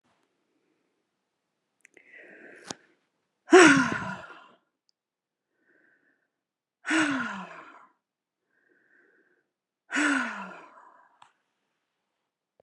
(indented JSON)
{
  "exhalation_length": "12.6 s",
  "exhalation_amplitude": 25733,
  "exhalation_signal_mean_std_ratio": 0.23,
  "survey_phase": "beta (2021-08-13 to 2022-03-07)",
  "age": "65+",
  "gender": "Female",
  "wearing_mask": "No",
  "symptom_none": true,
  "smoker_status": "Never smoked",
  "respiratory_condition_asthma": false,
  "respiratory_condition_other": false,
  "recruitment_source": "REACT",
  "submission_delay": "3 days",
  "covid_test_result": "Negative",
  "covid_test_method": "RT-qPCR"
}